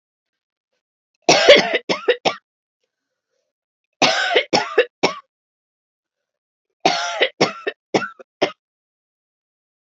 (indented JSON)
{
  "three_cough_length": "9.8 s",
  "three_cough_amplitude": 32768,
  "three_cough_signal_mean_std_ratio": 0.33,
  "survey_phase": "beta (2021-08-13 to 2022-03-07)",
  "age": "45-64",
  "gender": "Female",
  "wearing_mask": "No",
  "symptom_none": true,
  "smoker_status": "Never smoked",
  "respiratory_condition_asthma": false,
  "respiratory_condition_other": false,
  "recruitment_source": "REACT",
  "submission_delay": "1 day",
  "covid_test_result": "Negative",
  "covid_test_method": "RT-qPCR"
}